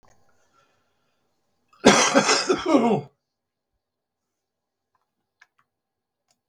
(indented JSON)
{
  "cough_length": "6.5 s",
  "cough_amplitude": 32768,
  "cough_signal_mean_std_ratio": 0.31,
  "survey_phase": "beta (2021-08-13 to 2022-03-07)",
  "age": "65+",
  "gender": "Male",
  "wearing_mask": "No",
  "symptom_cough_any": true,
  "symptom_runny_or_blocked_nose": true,
  "symptom_onset": "5 days",
  "smoker_status": "Never smoked",
  "respiratory_condition_asthma": false,
  "respiratory_condition_other": false,
  "recruitment_source": "REACT",
  "submission_delay": "4 days",
  "covid_test_result": "Negative",
  "covid_test_method": "RT-qPCR",
  "influenza_a_test_result": "Negative",
  "influenza_b_test_result": "Negative"
}